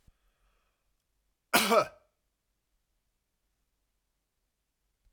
{"cough_length": "5.1 s", "cough_amplitude": 13077, "cough_signal_mean_std_ratio": 0.19, "survey_phase": "alpha (2021-03-01 to 2021-08-12)", "age": "65+", "gender": "Male", "wearing_mask": "No", "symptom_none": true, "smoker_status": "Never smoked", "respiratory_condition_asthma": false, "respiratory_condition_other": false, "recruitment_source": "REACT", "submission_delay": "2 days", "covid_test_result": "Negative", "covid_test_method": "RT-qPCR"}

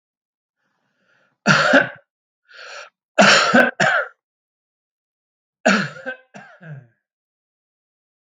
{"three_cough_length": "8.4 s", "three_cough_amplitude": 31296, "three_cough_signal_mean_std_ratio": 0.34, "survey_phase": "alpha (2021-03-01 to 2021-08-12)", "age": "45-64", "gender": "Male", "wearing_mask": "No", "symptom_none": true, "smoker_status": "Never smoked", "respiratory_condition_asthma": false, "respiratory_condition_other": false, "recruitment_source": "REACT", "submission_delay": "1 day", "covid_test_result": "Negative", "covid_test_method": "RT-qPCR"}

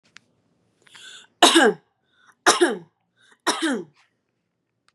{"three_cough_length": "4.9 s", "three_cough_amplitude": 31525, "three_cough_signal_mean_std_ratio": 0.32, "survey_phase": "beta (2021-08-13 to 2022-03-07)", "age": "18-44", "gender": "Female", "wearing_mask": "No", "symptom_none": true, "smoker_status": "Never smoked", "respiratory_condition_asthma": false, "respiratory_condition_other": false, "recruitment_source": "REACT", "submission_delay": "3 days", "covid_test_result": "Negative", "covid_test_method": "RT-qPCR", "influenza_a_test_result": "Negative", "influenza_b_test_result": "Negative"}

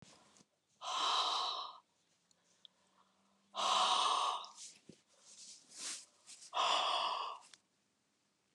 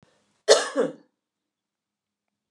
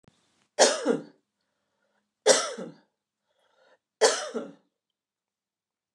{"exhalation_length": "8.5 s", "exhalation_amplitude": 3104, "exhalation_signal_mean_std_ratio": 0.5, "cough_length": "2.5 s", "cough_amplitude": 26936, "cough_signal_mean_std_ratio": 0.25, "three_cough_length": "5.9 s", "three_cough_amplitude": 20371, "three_cough_signal_mean_std_ratio": 0.29, "survey_phase": "beta (2021-08-13 to 2022-03-07)", "age": "65+", "gender": "Female", "wearing_mask": "No", "symptom_none": true, "smoker_status": "Never smoked", "respiratory_condition_asthma": false, "respiratory_condition_other": false, "recruitment_source": "REACT", "submission_delay": "0 days", "covid_test_result": "Negative", "covid_test_method": "RT-qPCR", "influenza_a_test_result": "Negative", "influenza_b_test_result": "Negative"}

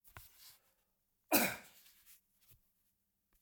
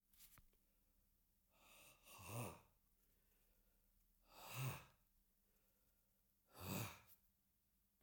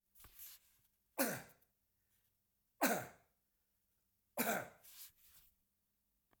{"cough_length": "3.4 s", "cough_amplitude": 6404, "cough_signal_mean_std_ratio": 0.23, "exhalation_length": "8.0 s", "exhalation_amplitude": 575, "exhalation_signal_mean_std_ratio": 0.38, "three_cough_length": "6.4 s", "three_cough_amplitude": 3011, "three_cough_signal_mean_std_ratio": 0.29, "survey_phase": "alpha (2021-03-01 to 2021-08-12)", "age": "65+", "gender": "Male", "wearing_mask": "No", "symptom_none": true, "smoker_status": "Never smoked", "respiratory_condition_asthma": false, "respiratory_condition_other": false, "recruitment_source": "REACT", "submission_delay": "11 days", "covid_test_result": "Negative", "covid_test_method": "RT-qPCR"}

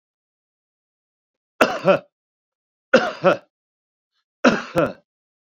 {"three_cough_length": "5.5 s", "three_cough_amplitude": 28539, "three_cough_signal_mean_std_ratio": 0.3, "survey_phase": "beta (2021-08-13 to 2022-03-07)", "age": "65+", "gender": "Male", "wearing_mask": "No", "symptom_cough_any": true, "smoker_status": "Current smoker (1 to 10 cigarettes per day)", "respiratory_condition_asthma": false, "respiratory_condition_other": false, "recruitment_source": "REACT", "submission_delay": "2 days", "covid_test_result": "Negative", "covid_test_method": "RT-qPCR"}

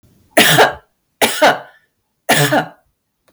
{"three_cough_length": "3.3 s", "three_cough_amplitude": 32768, "three_cough_signal_mean_std_ratio": 0.48, "survey_phase": "beta (2021-08-13 to 2022-03-07)", "age": "18-44", "gender": "Female", "wearing_mask": "No", "symptom_headache": true, "smoker_status": "Ex-smoker", "respiratory_condition_asthma": false, "respiratory_condition_other": false, "recruitment_source": "REACT", "submission_delay": "8 days", "covid_test_result": "Negative", "covid_test_method": "RT-qPCR", "influenza_a_test_result": "Negative", "influenza_b_test_result": "Negative"}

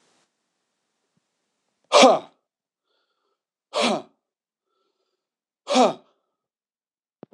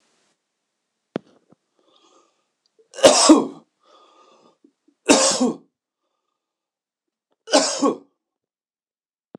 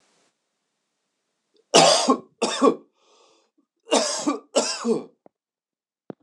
{"exhalation_length": "7.3 s", "exhalation_amplitude": 26028, "exhalation_signal_mean_std_ratio": 0.23, "three_cough_length": "9.4 s", "three_cough_amplitude": 26028, "three_cough_signal_mean_std_ratio": 0.27, "cough_length": "6.2 s", "cough_amplitude": 26028, "cough_signal_mean_std_ratio": 0.37, "survey_phase": "alpha (2021-03-01 to 2021-08-12)", "age": "45-64", "gender": "Male", "wearing_mask": "No", "symptom_cough_any": true, "symptom_shortness_of_breath": true, "symptom_abdominal_pain": true, "symptom_fatigue": true, "symptom_headache": true, "smoker_status": "Ex-smoker", "respiratory_condition_asthma": false, "respiratory_condition_other": false, "recruitment_source": "Test and Trace", "submission_delay": "2 days", "covid_test_result": "Positive", "covid_test_method": "RT-qPCR", "covid_ct_value": 17.7, "covid_ct_gene": "ORF1ab gene", "covid_ct_mean": 18.1, "covid_viral_load": "1200000 copies/ml", "covid_viral_load_category": "High viral load (>1M copies/ml)"}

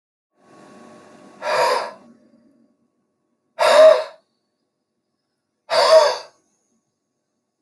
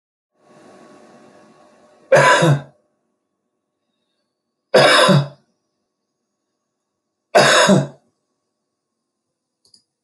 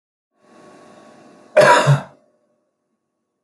{"exhalation_length": "7.6 s", "exhalation_amplitude": 29227, "exhalation_signal_mean_std_ratio": 0.33, "three_cough_length": "10.0 s", "three_cough_amplitude": 29014, "three_cough_signal_mean_std_ratio": 0.33, "cough_length": "3.4 s", "cough_amplitude": 27847, "cough_signal_mean_std_ratio": 0.3, "survey_phase": "alpha (2021-03-01 to 2021-08-12)", "age": "45-64", "gender": "Male", "wearing_mask": "No", "symptom_none": true, "symptom_cough_any": true, "smoker_status": "Never smoked", "respiratory_condition_asthma": false, "respiratory_condition_other": false, "recruitment_source": "REACT", "submission_delay": "2 days", "covid_test_result": "Negative", "covid_test_method": "RT-qPCR"}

